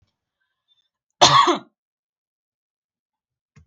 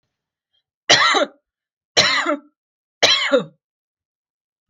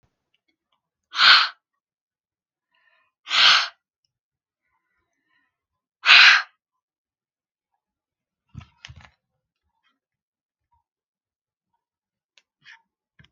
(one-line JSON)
{"cough_length": "3.7 s", "cough_amplitude": 32768, "cough_signal_mean_std_ratio": 0.24, "three_cough_length": "4.7 s", "three_cough_amplitude": 32768, "three_cough_signal_mean_std_ratio": 0.39, "exhalation_length": "13.3 s", "exhalation_amplitude": 32766, "exhalation_signal_mean_std_ratio": 0.21, "survey_phase": "beta (2021-08-13 to 2022-03-07)", "age": "18-44", "gender": "Female", "wearing_mask": "No", "symptom_none": true, "smoker_status": "Never smoked", "respiratory_condition_asthma": false, "respiratory_condition_other": false, "recruitment_source": "REACT", "submission_delay": "1 day", "covid_test_result": "Negative", "covid_test_method": "RT-qPCR", "influenza_a_test_result": "Unknown/Void", "influenza_b_test_result": "Unknown/Void"}